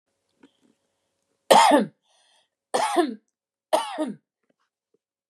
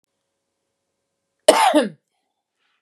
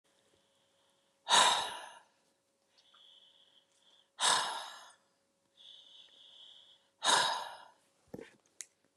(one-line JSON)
{"three_cough_length": "5.3 s", "three_cough_amplitude": 30195, "three_cough_signal_mean_std_ratio": 0.32, "cough_length": "2.8 s", "cough_amplitude": 32768, "cough_signal_mean_std_ratio": 0.28, "exhalation_length": "9.0 s", "exhalation_amplitude": 7655, "exhalation_signal_mean_std_ratio": 0.31, "survey_phase": "beta (2021-08-13 to 2022-03-07)", "age": "45-64", "gender": "Female", "wearing_mask": "No", "symptom_none": true, "smoker_status": "Current smoker (e-cigarettes or vapes only)", "respiratory_condition_asthma": false, "respiratory_condition_other": false, "recruitment_source": "REACT", "submission_delay": "0 days", "covid_test_result": "Negative", "covid_test_method": "RT-qPCR", "influenza_a_test_result": "Negative", "influenza_b_test_result": "Negative"}